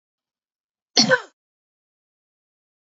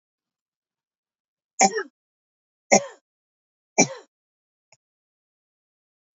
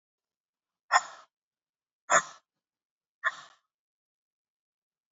{
  "cough_length": "3.0 s",
  "cough_amplitude": 30892,
  "cough_signal_mean_std_ratio": 0.2,
  "three_cough_length": "6.1 s",
  "three_cough_amplitude": 27828,
  "three_cough_signal_mean_std_ratio": 0.18,
  "exhalation_length": "5.1 s",
  "exhalation_amplitude": 14378,
  "exhalation_signal_mean_std_ratio": 0.18,
  "survey_phase": "beta (2021-08-13 to 2022-03-07)",
  "age": "45-64",
  "gender": "Female",
  "wearing_mask": "No",
  "symptom_none": true,
  "smoker_status": "Never smoked",
  "respiratory_condition_asthma": false,
  "respiratory_condition_other": false,
  "recruitment_source": "REACT",
  "submission_delay": "1 day",
  "covid_test_result": "Negative",
  "covid_test_method": "RT-qPCR",
  "influenza_a_test_result": "Unknown/Void",
  "influenza_b_test_result": "Unknown/Void"
}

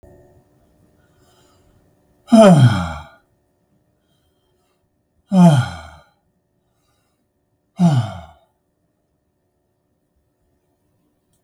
{
  "exhalation_length": "11.4 s",
  "exhalation_amplitude": 32768,
  "exhalation_signal_mean_std_ratio": 0.27,
  "survey_phase": "beta (2021-08-13 to 2022-03-07)",
  "age": "65+",
  "gender": "Male",
  "wearing_mask": "No",
  "symptom_none": true,
  "smoker_status": "Ex-smoker",
  "respiratory_condition_asthma": true,
  "respiratory_condition_other": false,
  "recruitment_source": "REACT",
  "submission_delay": "1 day",
  "covid_test_result": "Negative",
  "covid_test_method": "RT-qPCR",
  "influenza_a_test_result": "Negative",
  "influenza_b_test_result": "Negative"
}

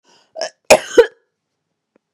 {
  "cough_length": "2.1 s",
  "cough_amplitude": 32768,
  "cough_signal_mean_std_ratio": 0.25,
  "survey_phase": "beta (2021-08-13 to 2022-03-07)",
  "age": "45-64",
  "gender": "Female",
  "wearing_mask": "No",
  "symptom_runny_or_blocked_nose": true,
  "symptom_headache": true,
  "symptom_onset": "4 days",
  "smoker_status": "Ex-smoker",
  "respiratory_condition_asthma": false,
  "respiratory_condition_other": false,
  "recruitment_source": "Test and Trace",
  "submission_delay": "2 days",
  "covid_test_result": "Positive",
  "covid_test_method": "RT-qPCR",
  "covid_ct_value": 23.5,
  "covid_ct_gene": "N gene",
  "covid_ct_mean": 24.5,
  "covid_viral_load": "9000 copies/ml",
  "covid_viral_load_category": "Minimal viral load (< 10K copies/ml)"
}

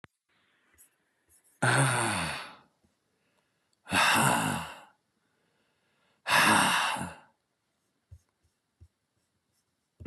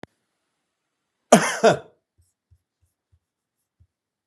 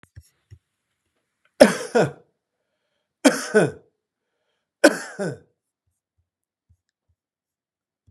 {
  "exhalation_length": "10.1 s",
  "exhalation_amplitude": 9610,
  "exhalation_signal_mean_std_ratio": 0.39,
  "cough_length": "4.3 s",
  "cough_amplitude": 32768,
  "cough_signal_mean_std_ratio": 0.2,
  "three_cough_length": "8.1 s",
  "three_cough_amplitude": 32768,
  "three_cough_signal_mean_std_ratio": 0.22,
  "survey_phase": "beta (2021-08-13 to 2022-03-07)",
  "age": "65+",
  "gender": "Male",
  "wearing_mask": "No",
  "symptom_diarrhoea": true,
  "symptom_fatigue": true,
  "symptom_onset": "12 days",
  "smoker_status": "Ex-smoker",
  "respiratory_condition_asthma": false,
  "respiratory_condition_other": false,
  "recruitment_source": "REACT",
  "submission_delay": "3 days",
  "covid_test_result": "Negative",
  "covid_test_method": "RT-qPCR"
}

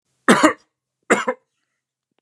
{
  "cough_length": "2.2 s",
  "cough_amplitude": 32767,
  "cough_signal_mean_std_ratio": 0.31,
  "survey_phase": "beta (2021-08-13 to 2022-03-07)",
  "age": "18-44",
  "gender": "Male",
  "wearing_mask": "No",
  "symptom_runny_or_blocked_nose": true,
  "smoker_status": "Never smoked",
  "respiratory_condition_asthma": false,
  "respiratory_condition_other": false,
  "recruitment_source": "REACT",
  "submission_delay": "1 day",
  "covid_test_result": "Negative",
  "covid_test_method": "RT-qPCR",
  "influenza_a_test_result": "Negative",
  "influenza_b_test_result": "Negative"
}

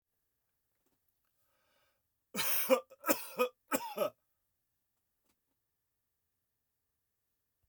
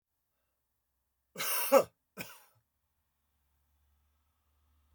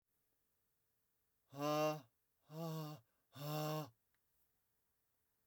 {
  "three_cough_length": "7.7 s",
  "three_cough_amplitude": 6461,
  "three_cough_signal_mean_std_ratio": 0.27,
  "cough_length": "4.9 s",
  "cough_amplitude": 9942,
  "cough_signal_mean_std_ratio": 0.21,
  "exhalation_length": "5.5 s",
  "exhalation_amplitude": 1309,
  "exhalation_signal_mean_std_ratio": 0.41,
  "survey_phase": "beta (2021-08-13 to 2022-03-07)",
  "age": "65+",
  "gender": "Male",
  "wearing_mask": "No",
  "symptom_cough_any": true,
  "smoker_status": "Never smoked",
  "respiratory_condition_asthma": false,
  "respiratory_condition_other": false,
  "recruitment_source": "REACT",
  "submission_delay": "2 days",
  "covid_test_result": "Negative",
  "covid_test_method": "RT-qPCR"
}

